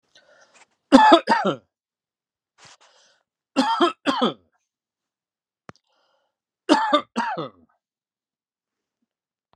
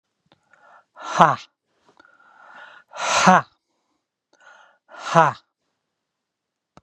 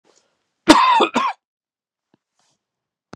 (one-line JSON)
{"three_cough_length": "9.6 s", "three_cough_amplitude": 32767, "three_cough_signal_mean_std_ratio": 0.3, "exhalation_length": "6.8 s", "exhalation_amplitude": 32768, "exhalation_signal_mean_std_ratio": 0.26, "cough_length": "3.2 s", "cough_amplitude": 32768, "cough_signal_mean_std_ratio": 0.33, "survey_phase": "beta (2021-08-13 to 2022-03-07)", "age": "45-64", "gender": "Male", "wearing_mask": "No", "symptom_abdominal_pain": true, "symptom_fatigue": true, "symptom_fever_high_temperature": true, "symptom_headache": true, "symptom_onset": "3 days", "smoker_status": "Never smoked", "respiratory_condition_asthma": false, "respiratory_condition_other": false, "recruitment_source": "Test and Trace", "submission_delay": "3 days", "covid_test_result": "Positive", "covid_test_method": "ePCR"}